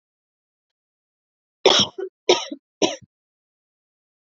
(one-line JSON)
{"cough_length": "4.4 s", "cough_amplitude": 27739, "cough_signal_mean_std_ratio": 0.25, "survey_phase": "beta (2021-08-13 to 2022-03-07)", "age": "18-44", "gender": "Female", "wearing_mask": "No", "symptom_cough_any": true, "symptom_runny_or_blocked_nose": true, "symptom_sore_throat": true, "symptom_onset": "5 days", "smoker_status": "Ex-smoker", "respiratory_condition_asthma": false, "respiratory_condition_other": false, "recruitment_source": "Test and Trace", "submission_delay": "1 day", "covid_test_result": "Positive", "covid_test_method": "RT-qPCR", "covid_ct_value": 26.2, "covid_ct_gene": "ORF1ab gene", "covid_ct_mean": 26.8, "covid_viral_load": "1600 copies/ml", "covid_viral_load_category": "Minimal viral load (< 10K copies/ml)"}